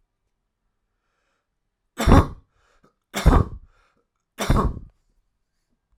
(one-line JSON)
{"three_cough_length": "6.0 s", "three_cough_amplitude": 32768, "three_cough_signal_mean_std_ratio": 0.28, "survey_phase": "alpha (2021-03-01 to 2021-08-12)", "age": "18-44", "gender": "Male", "wearing_mask": "No", "symptom_none": true, "symptom_onset": "13 days", "smoker_status": "Never smoked", "respiratory_condition_asthma": false, "respiratory_condition_other": false, "recruitment_source": "REACT", "submission_delay": "2 days", "covid_test_result": "Negative", "covid_test_method": "RT-qPCR"}